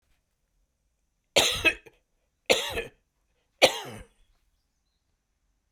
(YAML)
three_cough_length: 5.7 s
three_cough_amplitude: 21985
three_cough_signal_mean_std_ratio: 0.26
survey_phase: beta (2021-08-13 to 2022-03-07)
age: 65+
gender: Male
wearing_mask: 'No'
symptom_runny_or_blocked_nose: true
smoker_status: Never smoked
respiratory_condition_asthma: false
respiratory_condition_other: false
recruitment_source: REACT
submission_delay: 1 day
covid_test_result: Negative
covid_test_method: RT-qPCR
influenza_a_test_result: Negative
influenza_b_test_result: Negative